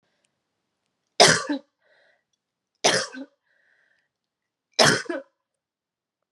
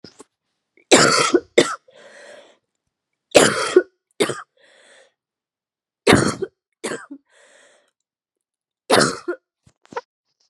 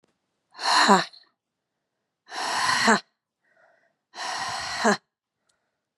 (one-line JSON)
{"three_cough_length": "6.3 s", "three_cough_amplitude": 31208, "three_cough_signal_mean_std_ratio": 0.26, "cough_length": "10.5 s", "cough_amplitude": 32768, "cough_signal_mean_std_ratio": 0.31, "exhalation_length": "6.0 s", "exhalation_amplitude": 27540, "exhalation_signal_mean_std_ratio": 0.39, "survey_phase": "beta (2021-08-13 to 2022-03-07)", "age": "18-44", "gender": "Female", "wearing_mask": "No", "symptom_cough_any": true, "symptom_new_continuous_cough": true, "symptom_runny_or_blocked_nose": true, "symptom_shortness_of_breath": true, "symptom_sore_throat": true, "symptom_fatigue": true, "symptom_headache": true, "symptom_change_to_sense_of_smell_or_taste": true, "symptom_loss_of_taste": true, "symptom_onset": "2 days", "smoker_status": "Never smoked", "respiratory_condition_asthma": false, "respiratory_condition_other": false, "recruitment_source": "Test and Trace", "submission_delay": "2 days", "covid_test_result": "Positive", "covid_test_method": "RT-qPCR", "covid_ct_value": 24.3, "covid_ct_gene": "ORF1ab gene"}